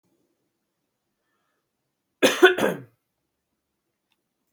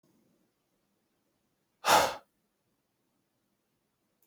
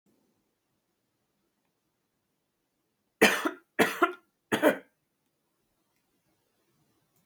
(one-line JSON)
{"cough_length": "4.5 s", "cough_amplitude": 28265, "cough_signal_mean_std_ratio": 0.21, "exhalation_length": "4.3 s", "exhalation_amplitude": 10387, "exhalation_signal_mean_std_ratio": 0.19, "three_cough_length": "7.3 s", "three_cough_amplitude": 16055, "three_cough_signal_mean_std_ratio": 0.23, "survey_phase": "beta (2021-08-13 to 2022-03-07)", "age": "18-44", "gender": "Male", "wearing_mask": "No", "symptom_cough_any": true, "symptom_new_continuous_cough": true, "symptom_runny_or_blocked_nose": true, "symptom_shortness_of_breath": true, "symptom_sore_throat": true, "symptom_fatigue": true, "symptom_headache": true, "symptom_onset": "2 days", "smoker_status": "Ex-smoker", "respiratory_condition_asthma": false, "respiratory_condition_other": false, "recruitment_source": "Test and Trace", "submission_delay": "1 day", "covid_test_result": "Positive", "covid_test_method": "RT-qPCR", "covid_ct_value": 16.7, "covid_ct_gene": "ORF1ab gene", "covid_ct_mean": 16.8, "covid_viral_load": "3100000 copies/ml", "covid_viral_load_category": "High viral load (>1M copies/ml)"}